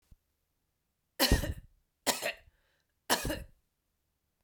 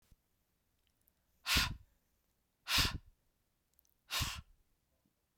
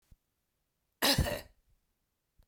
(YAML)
three_cough_length: 4.4 s
three_cough_amplitude: 9695
three_cough_signal_mean_std_ratio: 0.31
exhalation_length: 5.4 s
exhalation_amplitude: 4171
exhalation_signal_mean_std_ratio: 0.3
cough_length: 2.5 s
cough_amplitude: 7844
cough_signal_mean_std_ratio: 0.29
survey_phase: beta (2021-08-13 to 2022-03-07)
age: 45-64
gender: Female
wearing_mask: 'No'
symptom_cough_any: true
symptom_runny_or_blocked_nose: true
symptom_fatigue: true
symptom_headache: true
symptom_other: true
symptom_onset: 2 days
smoker_status: Never smoked
respiratory_condition_asthma: false
respiratory_condition_other: false
recruitment_source: Test and Trace
submission_delay: 2 days
covid_test_result: Positive
covid_test_method: RT-qPCR